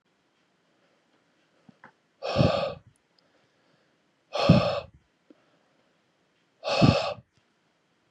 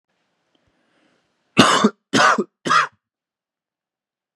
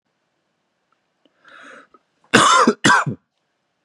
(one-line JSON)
{"exhalation_length": "8.1 s", "exhalation_amplitude": 20480, "exhalation_signal_mean_std_ratio": 0.3, "three_cough_length": "4.4 s", "three_cough_amplitude": 32768, "three_cough_signal_mean_std_ratio": 0.33, "cough_length": "3.8 s", "cough_amplitude": 32767, "cough_signal_mean_std_ratio": 0.34, "survey_phase": "beta (2021-08-13 to 2022-03-07)", "age": "18-44", "gender": "Male", "wearing_mask": "No", "symptom_cough_any": true, "symptom_runny_or_blocked_nose": true, "symptom_sore_throat": true, "symptom_fatigue": true, "symptom_fever_high_temperature": true, "symptom_headache": true, "symptom_other": true, "smoker_status": "Never smoked", "respiratory_condition_asthma": false, "respiratory_condition_other": false, "recruitment_source": "Test and Trace", "submission_delay": "2 days", "covid_test_result": "Positive", "covid_test_method": "LFT"}